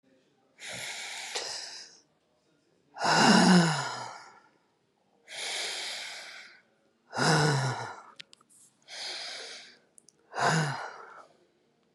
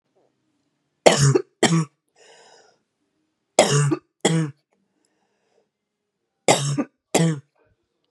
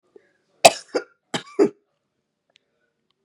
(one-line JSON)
{"exhalation_length": "11.9 s", "exhalation_amplitude": 15141, "exhalation_signal_mean_std_ratio": 0.43, "three_cough_length": "8.1 s", "three_cough_amplitude": 32768, "three_cough_signal_mean_std_ratio": 0.36, "cough_length": "3.2 s", "cough_amplitude": 32768, "cough_signal_mean_std_ratio": 0.19, "survey_phase": "beta (2021-08-13 to 2022-03-07)", "age": "45-64", "gender": "Female", "wearing_mask": "No", "symptom_cough_any": true, "symptom_runny_or_blocked_nose": true, "symptom_sore_throat": true, "symptom_fatigue": true, "symptom_headache": true, "symptom_loss_of_taste": true, "symptom_onset": "2 days", "smoker_status": "Ex-smoker", "respiratory_condition_asthma": false, "respiratory_condition_other": false, "recruitment_source": "Test and Trace", "submission_delay": "1 day", "covid_test_result": "Positive", "covid_test_method": "RT-qPCR", "covid_ct_value": 18.6, "covid_ct_gene": "ORF1ab gene", "covid_ct_mean": 19.2, "covid_viral_load": "520000 copies/ml", "covid_viral_load_category": "Low viral load (10K-1M copies/ml)"}